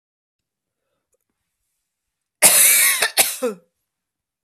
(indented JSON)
{
  "cough_length": "4.4 s",
  "cough_amplitude": 32768,
  "cough_signal_mean_std_ratio": 0.35,
  "survey_phase": "beta (2021-08-13 to 2022-03-07)",
  "age": "45-64",
  "gender": "Female",
  "wearing_mask": "No",
  "symptom_cough_any": true,
  "symptom_runny_or_blocked_nose": true,
  "symptom_sore_throat": true,
  "symptom_fatigue": true,
  "symptom_fever_high_temperature": true,
  "symptom_headache": true,
  "symptom_change_to_sense_of_smell_or_taste": true,
  "smoker_status": "Never smoked",
  "respiratory_condition_asthma": false,
  "respiratory_condition_other": false,
  "recruitment_source": "Test and Trace",
  "submission_delay": "2 days",
  "covid_test_result": "Positive",
  "covid_test_method": "RT-qPCR",
  "covid_ct_value": 27.8,
  "covid_ct_gene": "ORF1ab gene"
}